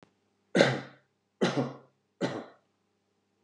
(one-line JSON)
{"three_cough_length": "3.4 s", "three_cough_amplitude": 19060, "three_cough_signal_mean_std_ratio": 0.33, "survey_phase": "beta (2021-08-13 to 2022-03-07)", "age": "45-64", "gender": "Male", "wearing_mask": "No", "symptom_none": true, "smoker_status": "Ex-smoker", "respiratory_condition_asthma": false, "respiratory_condition_other": false, "recruitment_source": "REACT", "submission_delay": "1 day", "covid_test_result": "Negative", "covid_test_method": "RT-qPCR"}